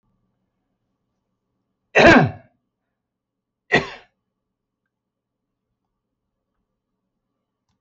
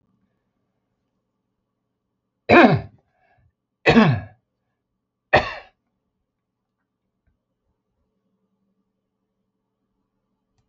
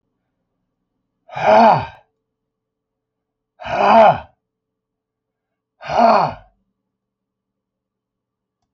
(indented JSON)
{
  "cough_length": "7.8 s",
  "cough_amplitude": 28799,
  "cough_signal_mean_std_ratio": 0.19,
  "three_cough_length": "10.7 s",
  "three_cough_amplitude": 28244,
  "three_cough_signal_mean_std_ratio": 0.21,
  "exhalation_length": "8.7 s",
  "exhalation_amplitude": 30100,
  "exhalation_signal_mean_std_ratio": 0.31,
  "survey_phase": "alpha (2021-03-01 to 2021-08-12)",
  "age": "65+",
  "gender": "Male",
  "wearing_mask": "No",
  "symptom_none": true,
  "smoker_status": "Never smoked",
  "respiratory_condition_asthma": false,
  "respiratory_condition_other": false,
  "recruitment_source": "REACT",
  "submission_delay": "0 days",
  "covid_test_result": "Negative",
  "covid_test_method": "RT-qPCR"
}